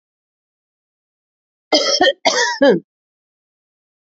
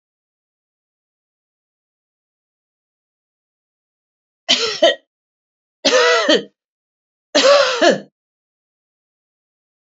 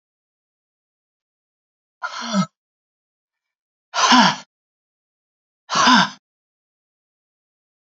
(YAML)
cough_length: 4.2 s
cough_amplitude: 31352
cough_signal_mean_std_ratio: 0.36
three_cough_length: 9.8 s
three_cough_amplitude: 32571
three_cough_signal_mean_std_ratio: 0.31
exhalation_length: 7.9 s
exhalation_amplitude: 29861
exhalation_signal_mean_std_ratio: 0.28
survey_phase: alpha (2021-03-01 to 2021-08-12)
age: 65+
gender: Female
wearing_mask: 'No'
symptom_none: true
smoker_status: Ex-smoker
respiratory_condition_asthma: false
respiratory_condition_other: false
recruitment_source: REACT
submission_delay: 2 days
covid_test_result: Negative
covid_test_method: RT-qPCR